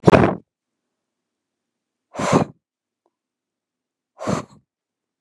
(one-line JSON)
{"exhalation_length": "5.2 s", "exhalation_amplitude": 32768, "exhalation_signal_mean_std_ratio": 0.25, "survey_phase": "beta (2021-08-13 to 2022-03-07)", "age": "65+", "gender": "Female", "wearing_mask": "No", "symptom_none": true, "smoker_status": "Never smoked", "respiratory_condition_asthma": false, "respiratory_condition_other": false, "recruitment_source": "REACT", "submission_delay": "5 days", "covid_test_result": "Negative", "covid_test_method": "RT-qPCR", "influenza_a_test_result": "Negative", "influenza_b_test_result": "Negative"}